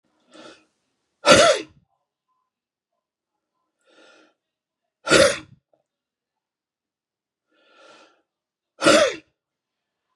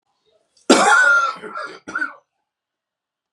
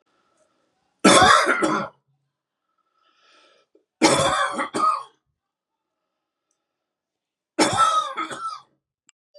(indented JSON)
{
  "exhalation_length": "10.2 s",
  "exhalation_amplitude": 32256,
  "exhalation_signal_mean_std_ratio": 0.24,
  "cough_length": "3.3 s",
  "cough_amplitude": 32767,
  "cough_signal_mean_std_ratio": 0.43,
  "three_cough_length": "9.4 s",
  "three_cough_amplitude": 30817,
  "three_cough_signal_mean_std_ratio": 0.39,
  "survey_phase": "beta (2021-08-13 to 2022-03-07)",
  "age": "45-64",
  "gender": "Male",
  "wearing_mask": "No",
  "symptom_shortness_of_breath": true,
  "symptom_fatigue": true,
  "symptom_headache": true,
  "symptom_onset": "12 days",
  "smoker_status": "Never smoked",
  "respiratory_condition_asthma": false,
  "respiratory_condition_other": false,
  "recruitment_source": "REACT",
  "submission_delay": "1 day",
  "covid_test_result": "Negative",
  "covid_test_method": "RT-qPCR"
}